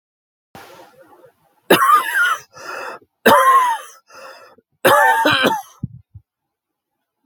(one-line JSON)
{"three_cough_length": "7.3 s", "three_cough_amplitude": 32767, "three_cough_signal_mean_std_ratio": 0.46, "survey_phase": "beta (2021-08-13 to 2022-03-07)", "age": "65+", "gender": "Male", "wearing_mask": "No", "symptom_cough_any": true, "symptom_fever_high_temperature": true, "symptom_headache": true, "symptom_onset": "3 days", "smoker_status": "Ex-smoker", "respiratory_condition_asthma": false, "respiratory_condition_other": true, "recruitment_source": "Test and Trace", "submission_delay": "1 day", "covid_test_result": "Positive", "covid_test_method": "RT-qPCR", "covid_ct_value": 18.0, "covid_ct_gene": "N gene"}